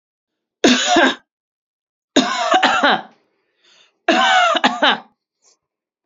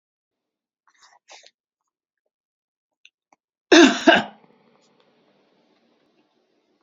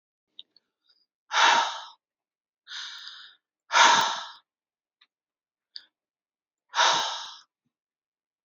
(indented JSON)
{
  "three_cough_length": "6.1 s",
  "three_cough_amplitude": 32768,
  "three_cough_signal_mean_std_ratio": 0.49,
  "cough_length": "6.8 s",
  "cough_amplitude": 30055,
  "cough_signal_mean_std_ratio": 0.19,
  "exhalation_length": "8.4 s",
  "exhalation_amplitude": 19332,
  "exhalation_signal_mean_std_ratio": 0.32,
  "survey_phase": "beta (2021-08-13 to 2022-03-07)",
  "age": "45-64",
  "gender": "Female",
  "wearing_mask": "No",
  "symptom_none": true,
  "smoker_status": "Never smoked",
  "respiratory_condition_asthma": false,
  "respiratory_condition_other": false,
  "recruitment_source": "REACT",
  "submission_delay": "3 days",
  "covid_test_result": "Negative",
  "covid_test_method": "RT-qPCR",
  "influenza_a_test_result": "Negative",
  "influenza_b_test_result": "Negative"
}